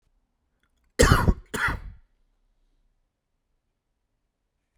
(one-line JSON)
{"cough_length": "4.8 s", "cough_amplitude": 25891, "cough_signal_mean_std_ratio": 0.25, "survey_phase": "beta (2021-08-13 to 2022-03-07)", "age": "18-44", "gender": "Male", "wearing_mask": "No", "symptom_cough_any": true, "symptom_runny_or_blocked_nose": true, "symptom_change_to_sense_of_smell_or_taste": true, "smoker_status": "Current smoker (e-cigarettes or vapes only)", "respiratory_condition_asthma": false, "respiratory_condition_other": false, "recruitment_source": "Test and Trace", "submission_delay": "1 day", "covid_test_result": "Positive", "covid_test_method": "RT-qPCR", "covid_ct_value": 33.9, "covid_ct_gene": "ORF1ab gene"}